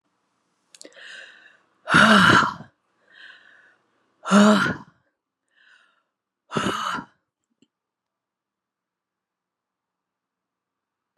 {"exhalation_length": "11.2 s", "exhalation_amplitude": 26605, "exhalation_signal_mean_std_ratio": 0.29, "survey_phase": "beta (2021-08-13 to 2022-03-07)", "age": "45-64", "gender": "Female", "wearing_mask": "Yes", "symptom_none": true, "smoker_status": "Ex-smoker", "respiratory_condition_asthma": false, "respiratory_condition_other": false, "recruitment_source": "REACT", "submission_delay": "1 day", "covid_test_result": "Negative", "covid_test_method": "RT-qPCR"}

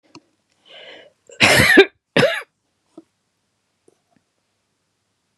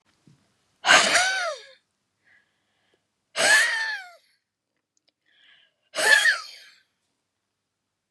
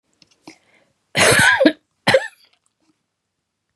{"cough_length": "5.4 s", "cough_amplitude": 32768, "cough_signal_mean_std_ratio": 0.28, "exhalation_length": "8.1 s", "exhalation_amplitude": 24423, "exhalation_signal_mean_std_ratio": 0.36, "three_cough_length": "3.8 s", "three_cough_amplitude": 32276, "three_cough_signal_mean_std_ratio": 0.36, "survey_phase": "beta (2021-08-13 to 2022-03-07)", "age": "65+", "gender": "Female", "wearing_mask": "No", "symptom_none": true, "symptom_onset": "8 days", "smoker_status": "Never smoked", "respiratory_condition_asthma": false, "respiratory_condition_other": false, "recruitment_source": "REACT", "submission_delay": "4 days", "covid_test_result": "Negative", "covid_test_method": "RT-qPCR", "influenza_a_test_result": "Negative", "influenza_b_test_result": "Negative"}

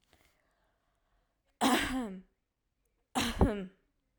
{"cough_length": "4.2 s", "cough_amplitude": 6593, "cough_signal_mean_std_ratio": 0.37, "survey_phase": "alpha (2021-03-01 to 2021-08-12)", "age": "18-44", "gender": "Female", "wearing_mask": "No", "symptom_none": true, "smoker_status": "Never smoked", "respiratory_condition_asthma": false, "respiratory_condition_other": false, "recruitment_source": "REACT", "submission_delay": "1 day", "covid_test_result": "Negative", "covid_test_method": "RT-qPCR"}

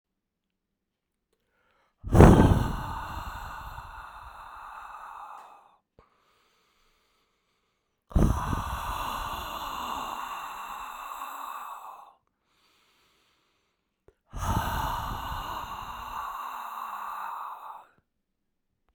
{"exhalation_length": "18.9 s", "exhalation_amplitude": 29911, "exhalation_signal_mean_std_ratio": 0.35, "survey_phase": "beta (2021-08-13 to 2022-03-07)", "age": "45-64", "gender": "Male", "wearing_mask": "No", "symptom_cough_any": true, "symptom_sore_throat": true, "symptom_fatigue": true, "symptom_fever_high_temperature": true, "symptom_onset": "3 days", "smoker_status": "Never smoked", "respiratory_condition_asthma": false, "respiratory_condition_other": false, "recruitment_source": "Test and Trace", "submission_delay": "1 day", "covid_test_result": "Positive", "covid_test_method": "RT-qPCR", "covid_ct_value": 17.0, "covid_ct_gene": "ORF1ab gene", "covid_ct_mean": 17.5, "covid_viral_load": "1800000 copies/ml", "covid_viral_load_category": "High viral load (>1M copies/ml)"}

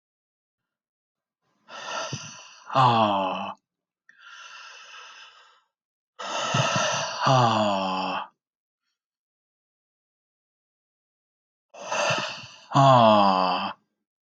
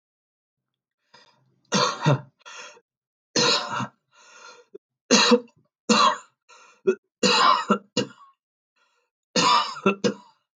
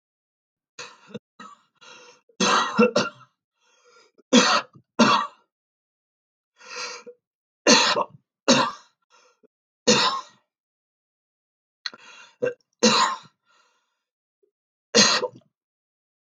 {"exhalation_length": "14.3 s", "exhalation_amplitude": 16493, "exhalation_signal_mean_std_ratio": 0.43, "three_cough_length": "10.6 s", "three_cough_amplitude": 23912, "three_cough_signal_mean_std_ratio": 0.41, "cough_length": "16.3 s", "cough_amplitude": 28215, "cough_signal_mean_std_ratio": 0.33, "survey_phase": "beta (2021-08-13 to 2022-03-07)", "age": "18-44", "gender": "Male", "wearing_mask": "No", "symptom_none": true, "smoker_status": "Ex-smoker", "respiratory_condition_asthma": false, "respiratory_condition_other": false, "recruitment_source": "Test and Trace", "submission_delay": "3 days", "covid_test_result": "Positive", "covid_test_method": "RT-qPCR", "covid_ct_value": 25.1, "covid_ct_gene": "ORF1ab gene"}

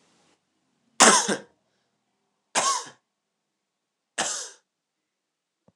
{"three_cough_length": "5.8 s", "three_cough_amplitude": 26028, "three_cough_signal_mean_std_ratio": 0.26, "survey_phase": "beta (2021-08-13 to 2022-03-07)", "age": "18-44", "gender": "Male", "wearing_mask": "No", "symptom_none": true, "smoker_status": "Never smoked", "respiratory_condition_asthma": false, "respiratory_condition_other": false, "recruitment_source": "REACT", "submission_delay": "1 day", "covid_test_result": "Negative", "covid_test_method": "RT-qPCR", "influenza_a_test_result": "Negative", "influenza_b_test_result": "Negative"}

